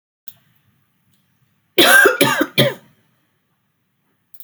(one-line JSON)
{"cough_length": "4.4 s", "cough_amplitude": 32768, "cough_signal_mean_std_ratio": 0.34, "survey_phase": "beta (2021-08-13 to 2022-03-07)", "age": "45-64", "gender": "Female", "wearing_mask": "No", "symptom_cough_any": true, "symptom_new_continuous_cough": true, "symptom_runny_or_blocked_nose": true, "symptom_sore_throat": true, "symptom_fatigue": true, "smoker_status": "Never smoked", "respiratory_condition_asthma": false, "respiratory_condition_other": false, "recruitment_source": "Test and Trace", "submission_delay": "1 day", "covid_test_result": "Positive", "covid_test_method": "RT-qPCR", "covid_ct_value": 27.8, "covid_ct_gene": "N gene"}